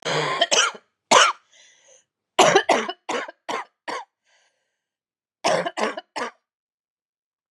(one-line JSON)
{"three_cough_length": "7.5 s", "three_cough_amplitude": 29374, "three_cough_signal_mean_std_ratio": 0.39, "survey_phase": "beta (2021-08-13 to 2022-03-07)", "age": "45-64", "gender": "Female", "wearing_mask": "No", "symptom_cough_any": true, "symptom_new_continuous_cough": true, "symptom_runny_or_blocked_nose": true, "symptom_shortness_of_breath": true, "symptom_sore_throat": true, "symptom_fatigue": true, "symptom_change_to_sense_of_smell_or_taste": true, "symptom_loss_of_taste": true, "symptom_other": true, "symptom_onset": "6 days", "smoker_status": "Never smoked", "respiratory_condition_asthma": false, "respiratory_condition_other": false, "recruitment_source": "Test and Trace", "submission_delay": "1 day", "covid_test_result": "Negative", "covid_test_method": "ePCR"}